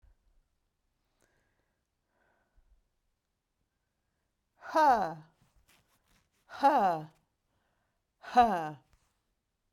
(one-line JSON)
{"exhalation_length": "9.7 s", "exhalation_amplitude": 9045, "exhalation_signal_mean_std_ratio": 0.27, "survey_phase": "beta (2021-08-13 to 2022-03-07)", "age": "45-64", "gender": "Female", "wearing_mask": "No", "symptom_none": true, "symptom_onset": "12 days", "smoker_status": "Never smoked", "respiratory_condition_asthma": false, "respiratory_condition_other": false, "recruitment_source": "REACT", "submission_delay": "2 days", "covid_test_result": "Negative", "covid_test_method": "RT-qPCR"}